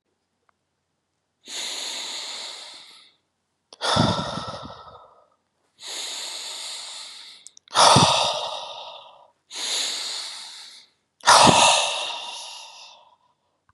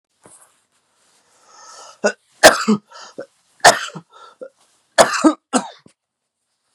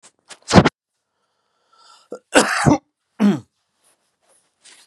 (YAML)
exhalation_length: 13.7 s
exhalation_amplitude: 31372
exhalation_signal_mean_std_ratio: 0.41
three_cough_length: 6.7 s
three_cough_amplitude: 32768
three_cough_signal_mean_std_ratio: 0.27
cough_length: 4.9 s
cough_amplitude: 32768
cough_signal_mean_std_ratio: 0.29
survey_phase: beta (2021-08-13 to 2022-03-07)
age: 18-44
gender: Male
wearing_mask: 'No'
symptom_none: true
smoker_status: Never smoked
respiratory_condition_asthma: false
respiratory_condition_other: false
recruitment_source: REACT
submission_delay: 3 days
covid_test_result: Negative
covid_test_method: RT-qPCR
influenza_a_test_result: Negative
influenza_b_test_result: Negative